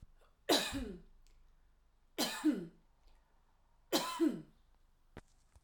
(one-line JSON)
{"three_cough_length": "5.6 s", "three_cough_amplitude": 4408, "three_cough_signal_mean_std_ratio": 0.39, "survey_phase": "alpha (2021-03-01 to 2021-08-12)", "age": "45-64", "gender": "Female", "wearing_mask": "No", "symptom_none": true, "smoker_status": "Ex-smoker", "respiratory_condition_asthma": false, "respiratory_condition_other": false, "recruitment_source": "REACT", "submission_delay": "1 day", "covid_test_result": "Negative", "covid_test_method": "RT-qPCR"}